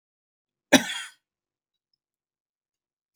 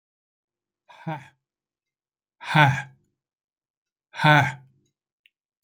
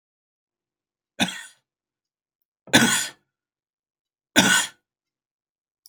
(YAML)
cough_length: 3.2 s
cough_amplitude: 26261
cough_signal_mean_std_ratio: 0.15
exhalation_length: 5.6 s
exhalation_amplitude: 25018
exhalation_signal_mean_std_ratio: 0.26
three_cough_length: 5.9 s
three_cough_amplitude: 29982
three_cough_signal_mean_std_ratio: 0.27
survey_phase: alpha (2021-03-01 to 2021-08-12)
age: 65+
gender: Male
wearing_mask: 'No'
symptom_none: true
smoker_status: Never smoked
respiratory_condition_asthma: true
respiratory_condition_other: false
recruitment_source: REACT
submission_delay: 1 day
covid_test_result: Negative
covid_test_method: RT-qPCR